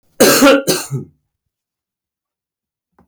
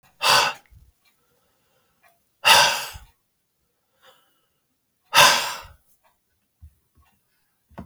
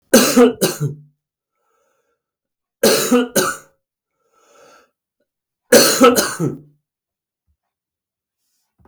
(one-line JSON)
{"cough_length": "3.1 s", "cough_amplitude": 32768, "cough_signal_mean_std_ratio": 0.37, "exhalation_length": "7.9 s", "exhalation_amplitude": 32768, "exhalation_signal_mean_std_ratio": 0.28, "three_cough_length": "8.9 s", "three_cough_amplitude": 32768, "three_cough_signal_mean_std_ratio": 0.36, "survey_phase": "beta (2021-08-13 to 2022-03-07)", "age": "45-64", "gender": "Male", "wearing_mask": "No", "symptom_none": true, "smoker_status": "Never smoked", "respiratory_condition_asthma": false, "respiratory_condition_other": false, "recruitment_source": "REACT", "submission_delay": "5 days", "covid_test_result": "Negative", "covid_test_method": "RT-qPCR", "influenza_a_test_result": "Negative", "influenza_b_test_result": "Negative"}